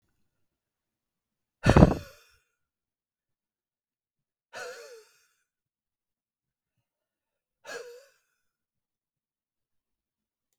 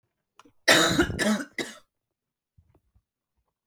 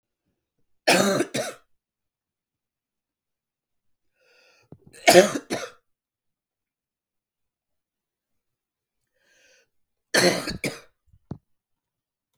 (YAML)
exhalation_length: 10.6 s
exhalation_amplitude: 32766
exhalation_signal_mean_std_ratio: 0.13
cough_length: 3.7 s
cough_amplitude: 20270
cough_signal_mean_std_ratio: 0.35
three_cough_length: 12.4 s
three_cough_amplitude: 31643
three_cough_signal_mean_std_ratio: 0.23
survey_phase: beta (2021-08-13 to 2022-03-07)
age: 18-44
gender: Male
wearing_mask: 'No'
symptom_none: true
smoker_status: Never smoked
respiratory_condition_asthma: false
respiratory_condition_other: false
recruitment_source: REACT
submission_delay: 1 day
covid_test_result: Negative
covid_test_method: RT-qPCR